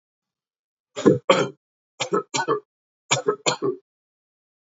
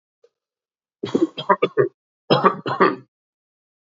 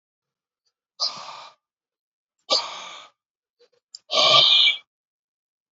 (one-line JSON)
{"three_cough_length": "4.8 s", "three_cough_amplitude": 27583, "three_cough_signal_mean_std_ratio": 0.36, "cough_length": "3.8 s", "cough_amplitude": 26861, "cough_signal_mean_std_ratio": 0.36, "exhalation_length": "5.7 s", "exhalation_amplitude": 23439, "exhalation_signal_mean_std_ratio": 0.33, "survey_phase": "alpha (2021-03-01 to 2021-08-12)", "age": "45-64", "gender": "Male", "wearing_mask": "No", "symptom_cough_any": true, "symptom_fatigue": true, "symptom_headache": true, "symptom_change_to_sense_of_smell_or_taste": true, "smoker_status": "Ex-smoker", "respiratory_condition_asthma": false, "respiratory_condition_other": false, "recruitment_source": "Test and Trace", "submission_delay": "1 day", "covid_test_result": "Positive", "covid_test_method": "RT-qPCR", "covid_ct_value": 16.3, "covid_ct_gene": "ORF1ab gene", "covid_ct_mean": 16.5, "covid_viral_load": "3900000 copies/ml", "covid_viral_load_category": "High viral load (>1M copies/ml)"}